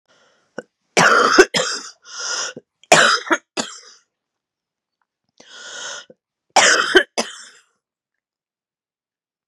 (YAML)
three_cough_length: 9.5 s
three_cough_amplitude: 32768
three_cough_signal_mean_std_ratio: 0.35
survey_phase: beta (2021-08-13 to 2022-03-07)
age: 45-64
gender: Female
wearing_mask: 'No'
symptom_cough_any: true
symptom_shortness_of_breath: true
symptom_fatigue: true
symptom_change_to_sense_of_smell_or_taste: true
symptom_other: true
smoker_status: Ex-smoker
respiratory_condition_asthma: false
respiratory_condition_other: false
recruitment_source: Test and Trace
submission_delay: 1 day
covid_test_result: Positive
covid_test_method: LFT